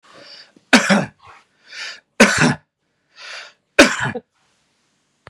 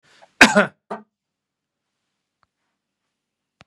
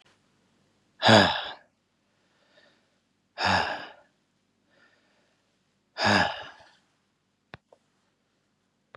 three_cough_length: 5.3 s
three_cough_amplitude: 32768
three_cough_signal_mean_std_ratio: 0.33
cough_length: 3.7 s
cough_amplitude: 32768
cough_signal_mean_std_ratio: 0.17
exhalation_length: 9.0 s
exhalation_amplitude: 20874
exhalation_signal_mean_std_ratio: 0.27
survey_phase: beta (2021-08-13 to 2022-03-07)
age: 45-64
gender: Male
wearing_mask: 'No'
symptom_none: true
smoker_status: Ex-smoker
respiratory_condition_asthma: false
respiratory_condition_other: false
recruitment_source: REACT
submission_delay: 2 days
covid_test_result: Negative
covid_test_method: RT-qPCR
influenza_a_test_result: Negative
influenza_b_test_result: Negative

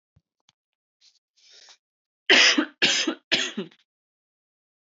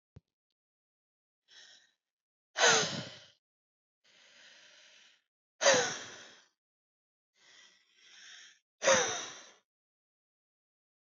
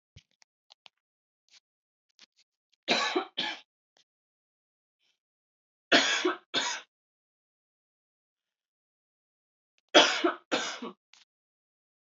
cough_length: 4.9 s
cough_amplitude: 19727
cough_signal_mean_std_ratio: 0.31
exhalation_length: 11.1 s
exhalation_amplitude: 8865
exhalation_signal_mean_std_ratio: 0.26
three_cough_length: 12.0 s
three_cough_amplitude: 19000
three_cough_signal_mean_std_ratio: 0.26
survey_phase: beta (2021-08-13 to 2022-03-07)
age: 18-44
gender: Female
wearing_mask: 'No'
symptom_none: true
smoker_status: Never smoked
respiratory_condition_asthma: true
respiratory_condition_other: false
recruitment_source: REACT
submission_delay: 2 days
covid_test_result: Negative
covid_test_method: RT-qPCR
influenza_a_test_result: Negative
influenza_b_test_result: Negative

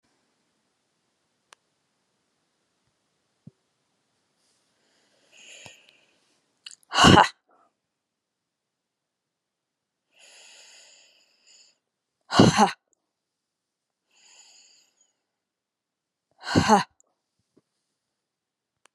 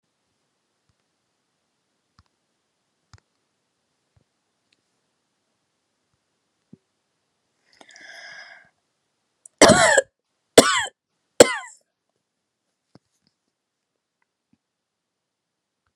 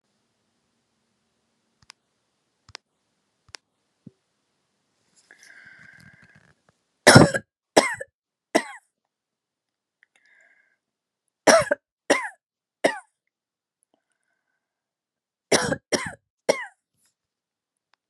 exhalation_length: 18.9 s
exhalation_amplitude: 29570
exhalation_signal_mean_std_ratio: 0.17
cough_length: 16.0 s
cough_amplitude: 32768
cough_signal_mean_std_ratio: 0.15
three_cough_length: 18.1 s
three_cough_amplitude: 32767
three_cough_signal_mean_std_ratio: 0.19
survey_phase: beta (2021-08-13 to 2022-03-07)
age: 65+
gender: Female
wearing_mask: 'No'
symptom_none: true
smoker_status: Never smoked
respiratory_condition_asthma: false
respiratory_condition_other: false
recruitment_source: REACT
submission_delay: 5 days
covid_test_result: Negative
covid_test_method: RT-qPCR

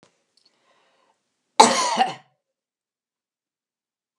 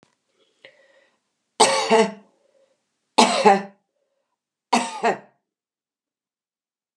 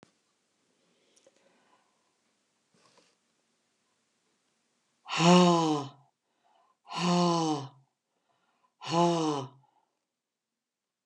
cough_length: 4.2 s
cough_amplitude: 32768
cough_signal_mean_std_ratio: 0.23
three_cough_length: 7.0 s
three_cough_amplitude: 32493
three_cough_signal_mean_std_ratio: 0.31
exhalation_length: 11.1 s
exhalation_amplitude: 11757
exhalation_signal_mean_std_ratio: 0.32
survey_phase: beta (2021-08-13 to 2022-03-07)
age: 65+
gender: Female
wearing_mask: 'No'
symptom_cough_any: true
symptom_fatigue: true
symptom_change_to_sense_of_smell_or_taste: true
symptom_loss_of_taste: true
symptom_onset: 5 days
smoker_status: Never smoked
respiratory_condition_asthma: false
respiratory_condition_other: true
recruitment_source: Test and Trace
submission_delay: 1 day
covid_test_result: Positive
covid_test_method: RT-qPCR
covid_ct_value: 21.1
covid_ct_gene: ORF1ab gene
covid_ct_mean: 21.9
covid_viral_load: 67000 copies/ml
covid_viral_load_category: Low viral load (10K-1M copies/ml)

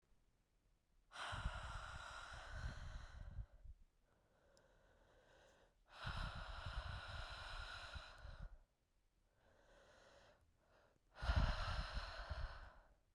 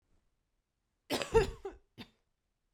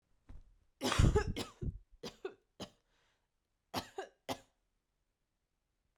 exhalation_length: 13.1 s
exhalation_amplitude: 1575
exhalation_signal_mean_std_ratio: 0.53
cough_length: 2.7 s
cough_amplitude: 6263
cough_signal_mean_std_ratio: 0.27
three_cough_length: 6.0 s
three_cough_amplitude: 5939
three_cough_signal_mean_std_ratio: 0.29
survey_phase: beta (2021-08-13 to 2022-03-07)
age: 18-44
gender: Female
wearing_mask: 'No'
symptom_runny_or_blocked_nose: true
symptom_fatigue: true
symptom_headache: true
symptom_other: true
symptom_onset: 3 days
smoker_status: Never smoked
respiratory_condition_asthma: false
respiratory_condition_other: false
recruitment_source: Test and Trace
submission_delay: 1 day
covid_test_result: Positive
covid_test_method: RT-qPCR
covid_ct_value: 30.6
covid_ct_gene: N gene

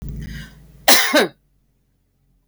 cough_length: 2.5 s
cough_amplitude: 32768
cough_signal_mean_std_ratio: 0.36
survey_phase: beta (2021-08-13 to 2022-03-07)
age: 45-64
gender: Female
wearing_mask: 'No'
symptom_runny_or_blocked_nose: true
symptom_fatigue: true
symptom_headache: true
symptom_onset: 12 days
smoker_status: Never smoked
respiratory_condition_asthma: false
respiratory_condition_other: false
recruitment_source: REACT
submission_delay: 2 days
covid_test_result: Negative
covid_test_method: RT-qPCR
influenza_a_test_result: Negative
influenza_b_test_result: Negative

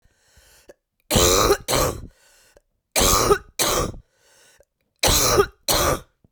three_cough_length: 6.3 s
three_cough_amplitude: 23161
three_cough_signal_mean_std_ratio: 0.5
survey_phase: beta (2021-08-13 to 2022-03-07)
age: 18-44
gender: Female
wearing_mask: 'No'
symptom_cough_any: true
symptom_runny_or_blocked_nose: true
symptom_fatigue: true
symptom_fever_high_temperature: true
symptom_headache: true
symptom_change_to_sense_of_smell_or_taste: true
symptom_loss_of_taste: true
symptom_onset: 5 days
smoker_status: Ex-smoker
respiratory_condition_asthma: false
respiratory_condition_other: false
recruitment_source: Test and Trace
submission_delay: 2 days
covid_test_result: Positive
covid_test_method: RT-qPCR
covid_ct_value: 22.3
covid_ct_gene: N gene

